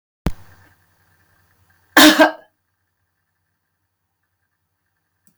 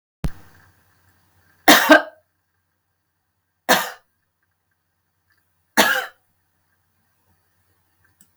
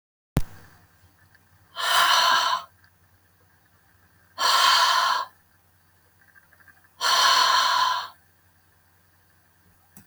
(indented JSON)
{
  "cough_length": "5.4 s",
  "cough_amplitude": 32766,
  "cough_signal_mean_std_ratio": 0.22,
  "three_cough_length": "8.4 s",
  "three_cough_amplitude": 32766,
  "three_cough_signal_mean_std_ratio": 0.23,
  "exhalation_length": "10.1 s",
  "exhalation_amplitude": 17072,
  "exhalation_signal_mean_std_ratio": 0.46,
  "survey_phase": "beta (2021-08-13 to 2022-03-07)",
  "age": "65+",
  "gender": "Female",
  "wearing_mask": "No",
  "symptom_none": true,
  "smoker_status": "Never smoked",
  "respiratory_condition_asthma": false,
  "respiratory_condition_other": false,
  "recruitment_source": "REACT",
  "submission_delay": "2 days",
  "covid_test_result": "Negative",
  "covid_test_method": "RT-qPCR",
  "influenza_a_test_result": "Negative",
  "influenza_b_test_result": "Negative"
}